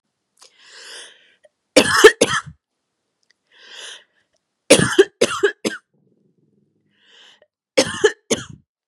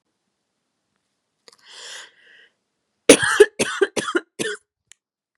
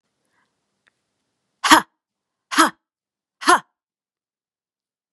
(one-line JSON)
{"three_cough_length": "8.9 s", "three_cough_amplitude": 32768, "three_cough_signal_mean_std_ratio": 0.28, "cough_length": "5.4 s", "cough_amplitude": 32768, "cough_signal_mean_std_ratio": 0.25, "exhalation_length": "5.1 s", "exhalation_amplitude": 32768, "exhalation_signal_mean_std_ratio": 0.21, "survey_phase": "beta (2021-08-13 to 2022-03-07)", "age": "18-44", "gender": "Female", "wearing_mask": "No", "symptom_none": true, "symptom_onset": "10 days", "smoker_status": "Current smoker (1 to 10 cigarettes per day)", "respiratory_condition_asthma": false, "respiratory_condition_other": false, "recruitment_source": "REACT", "submission_delay": "2 days", "covid_test_result": "Negative", "covid_test_method": "RT-qPCR", "influenza_a_test_result": "Negative", "influenza_b_test_result": "Negative"}